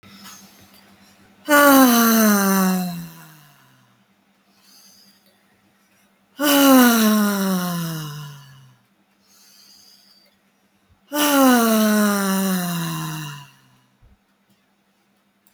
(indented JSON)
{
  "exhalation_length": "15.5 s",
  "exhalation_amplitude": 32768,
  "exhalation_signal_mean_std_ratio": 0.5,
  "survey_phase": "alpha (2021-03-01 to 2021-08-12)",
  "age": "18-44",
  "gender": "Female",
  "wearing_mask": "No",
  "symptom_none": true,
  "smoker_status": "Never smoked",
  "respiratory_condition_asthma": false,
  "respiratory_condition_other": false,
  "recruitment_source": "REACT",
  "submission_delay": "18 days",
  "covid_test_result": "Negative",
  "covid_test_method": "RT-qPCR"
}